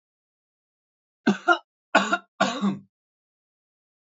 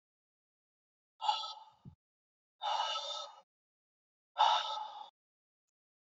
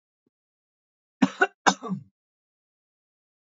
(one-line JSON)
{"three_cough_length": "4.2 s", "three_cough_amplitude": 18382, "three_cough_signal_mean_std_ratio": 0.3, "exhalation_length": "6.1 s", "exhalation_amplitude": 5092, "exhalation_signal_mean_std_ratio": 0.36, "cough_length": "3.5 s", "cough_amplitude": 24281, "cough_signal_mean_std_ratio": 0.2, "survey_phase": "beta (2021-08-13 to 2022-03-07)", "age": "18-44", "gender": "Male", "wearing_mask": "No", "symptom_runny_or_blocked_nose": true, "symptom_sore_throat": true, "symptom_onset": "3 days", "smoker_status": "Ex-smoker", "respiratory_condition_asthma": true, "respiratory_condition_other": false, "recruitment_source": "REACT", "submission_delay": "1 day", "covid_test_result": "Negative", "covid_test_method": "RT-qPCR", "influenza_a_test_result": "Negative", "influenza_b_test_result": "Negative"}